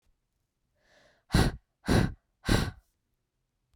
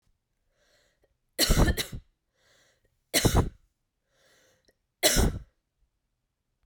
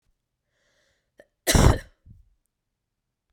{"exhalation_length": "3.8 s", "exhalation_amplitude": 10135, "exhalation_signal_mean_std_ratio": 0.33, "three_cough_length": "6.7 s", "three_cough_amplitude": 14040, "three_cough_signal_mean_std_ratio": 0.32, "cough_length": "3.3 s", "cough_amplitude": 25846, "cough_signal_mean_std_ratio": 0.23, "survey_phase": "beta (2021-08-13 to 2022-03-07)", "age": "18-44", "gender": "Female", "wearing_mask": "No", "symptom_runny_or_blocked_nose": true, "symptom_fatigue": true, "smoker_status": "Never smoked", "respiratory_condition_asthma": false, "respiratory_condition_other": false, "recruitment_source": "Test and Trace", "submission_delay": "3 days", "covid_test_result": "Positive", "covid_test_method": "LFT"}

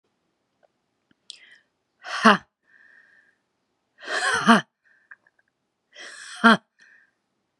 {"exhalation_length": "7.6 s", "exhalation_amplitude": 30130, "exhalation_signal_mean_std_ratio": 0.24, "survey_phase": "beta (2021-08-13 to 2022-03-07)", "age": "45-64", "gender": "Female", "wearing_mask": "No", "symptom_cough_any": true, "symptom_shortness_of_breath": true, "symptom_sore_throat": true, "symptom_fatigue": true, "symptom_headache": true, "symptom_other": true, "smoker_status": "Never smoked", "respiratory_condition_asthma": false, "respiratory_condition_other": false, "recruitment_source": "Test and Trace", "submission_delay": "2 days", "covid_test_result": "Positive", "covid_test_method": "RT-qPCR", "covid_ct_value": 23.6, "covid_ct_gene": "ORF1ab gene", "covid_ct_mean": 24.2, "covid_viral_load": "12000 copies/ml", "covid_viral_load_category": "Low viral load (10K-1M copies/ml)"}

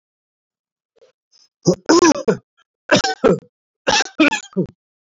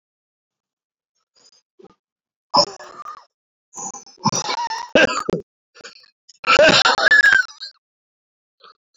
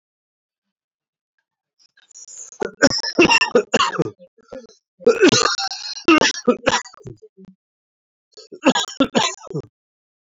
{"three_cough_length": "5.1 s", "three_cough_amplitude": 30927, "three_cough_signal_mean_std_ratio": 0.39, "exhalation_length": "9.0 s", "exhalation_amplitude": 27489, "exhalation_signal_mean_std_ratio": 0.36, "cough_length": "10.2 s", "cough_amplitude": 27757, "cough_signal_mean_std_ratio": 0.39, "survey_phase": "beta (2021-08-13 to 2022-03-07)", "age": "65+", "gender": "Male", "wearing_mask": "No", "symptom_cough_any": true, "symptom_runny_or_blocked_nose": true, "symptom_fever_high_temperature": true, "symptom_headache": true, "symptom_other": true, "symptom_onset": "10 days", "smoker_status": "Ex-smoker", "respiratory_condition_asthma": false, "respiratory_condition_other": true, "recruitment_source": "Test and Trace", "submission_delay": "1 day", "covid_test_result": "Positive", "covid_test_method": "RT-qPCR", "covid_ct_value": 20.4, "covid_ct_gene": "ORF1ab gene", "covid_ct_mean": 21.3, "covid_viral_load": "110000 copies/ml", "covid_viral_load_category": "Low viral load (10K-1M copies/ml)"}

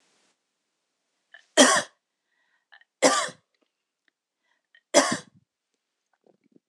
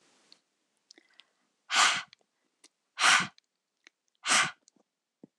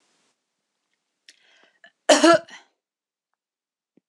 {"three_cough_length": "6.7 s", "three_cough_amplitude": 26028, "three_cough_signal_mean_std_ratio": 0.24, "exhalation_length": "5.4 s", "exhalation_amplitude": 10761, "exhalation_signal_mean_std_ratio": 0.3, "cough_length": "4.1 s", "cough_amplitude": 25050, "cough_signal_mean_std_ratio": 0.21, "survey_phase": "beta (2021-08-13 to 2022-03-07)", "age": "18-44", "gender": "Female", "wearing_mask": "No", "symptom_sore_throat": true, "symptom_onset": "12 days", "smoker_status": "Never smoked", "respiratory_condition_asthma": false, "respiratory_condition_other": false, "recruitment_source": "REACT", "submission_delay": "3 days", "covid_test_result": "Negative", "covid_test_method": "RT-qPCR", "influenza_a_test_result": "Negative", "influenza_b_test_result": "Negative"}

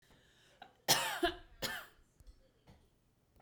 {"cough_length": "3.4 s", "cough_amplitude": 5539, "cough_signal_mean_std_ratio": 0.34, "survey_phase": "beta (2021-08-13 to 2022-03-07)", "age": "18-44", "gender": "Female", "wearing_mask": "No", "symptom_none": true, "smoker_status": "Ex-smoker", "respiratory_condition_asthma": false, "respiratory_condition_other": false, "recruitment_source": "REACT", "submission_delay": "1 day", "covid_test_result": "Negative", "covid_test_method": "RT-qPCR"}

